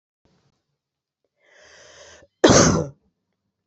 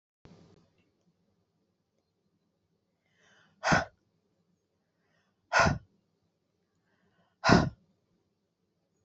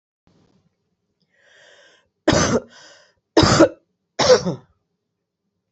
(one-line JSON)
{"cough_length": "3.7 s", "cough_amplitude": 27521, "cough_signal_mean_std_ratio": 0.26, "exhalation_length": "9.0 s", "exhalation_amplitude": 16669, "exhalation_signal_mean_std_ratio": 0.21, "three_cough_length": "5.7 s", "three_cough_amplitude": 29223, "three_cough_signal_mean_std_ratio": 0.32, "survey_phase": "beta (2021-08-13 to 2022-03-07)", "age": "45-64", "gender": "Female", "wearing_mask": "No", "symptom_cough_any": true, "symptom_runny_or_blocked_nose": true, "symptom_shortness_of_breath": true, "symptom_fatigue": true, "symptom_headache": true, "symptom_change_to_sense_of_smell_or_taste": true, "symptom_loss_of_taste": true, "symptom_onset": "3 days", "smoker_status": "Ex-smoker", "respiratory_condition_asthma": false, "respiratory_condition_other": false, "recruitment_source": "Test and Trace", "submission_delay": "2 days", "covid_test_result": "Positive", "covid_test_method": "RT-qPCR", "covid_ct_value": 24.9, "covid_ct_gene": "ORF1ab gene", "covid_ct_mean": 25.4, "covid_viral_load": "4700 copies/ml", "covid_viral_load_category": "Minimal viral load (< 10K copies/ml)"}